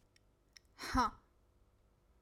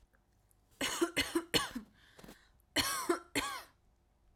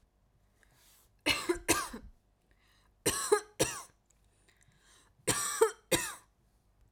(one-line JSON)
{"exhalation_length": "2.2 s", "exhalation_amplitude": 2998, "exhalation_signal_mean_std_ratio": 0.29, "cough_length": "4.4 s", "cough_amplitude": 6357, "cough_signal_mean_std_ratio": 0.44, "three_cough_length": "6.9 s", "three_cough_amplitude": 8361, "three_cough_signal_mean_std_ratio": 0.36, "survey_phase": "alpha (2021-03-01 to 2021-08-12)", "age": "18-44", "gender": "Female", "wearing_mask": "No", "symptom_none": true, "smoker_status": "Ex-smoker", "respiratory_condition_asthma": false, "respiratory_condition_other": false, "recruitment_source": "REACT", "submission_delay": "2 days", "covid_test_result": "Negative", "covid_test_method": "RT-qPCR"}